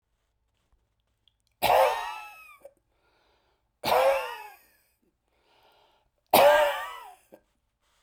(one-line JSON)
{"three_cough_length": "8.0 s", "three_cough_amplitude": 19191, "three_cough_signal_mean_std_ratio": 0.34, "survey_phase": "beta (2021-08-13 to 2022-03-07)", "age": "45-64", "gender": "Male", "wearing_mask": "No", "symptom_none": true, "smoker_status": "Never smoked", "respiratory_condition_asthma": false, "respiratory_condition_other": false, "recruitment_source": "REACT", "submission_delay": "2 days", "covid_test_result": "Negative", "covid_test_method": "RT-qPCR"}